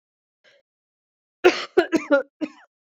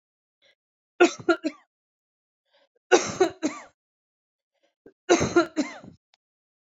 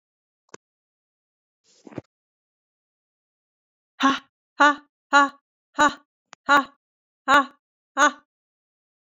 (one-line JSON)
{"cough_length": "3.0 s", "cough_amplitude": 26809, "cough_signal_mean_std_ratio": 0.3, "three_cough_length": "6.7 s", "three_cough_amplitude": 22011, "three_cough_signal_mean_std_ratio": 0.29, "exhalation_length": "9.0 s", "exhalation_amplitude": 21636, "exhalation_signal_mean_std_ratio": 0.25, "survey_phase": "beta (2021-08-13 to 2022-03-07)", "age": "18-44", "gender": "Female", "wearing_mask": "No", "symptom_cough_any": true, "symptom_runny_or_blocked_nose": true, "symptom_sore_throat": true, "symptom_fatigue": true, "symptom_headache": true, "symptom_change_to_sense_of_smell_or_taste": true, "symptom_onset": "2 days", "smoker_status": "Never smoked", "respiratory_condition_asthma": false, "respiratory_condition_other": false, "recruitment_source": "Test and Trace", "submission_delay": "2 days", "covid_test_result": "Positive", "covid_test_method": "RT-qPCR", "covid_ct_value": 14.9, "covid_ct_gene": "ORF1ab gene", "covid_ct_mean": 15.2, "covid_viral_load": "11000000 copies/ml", "covid_viral_load_category": "High viral load (>1M copies/ml)"}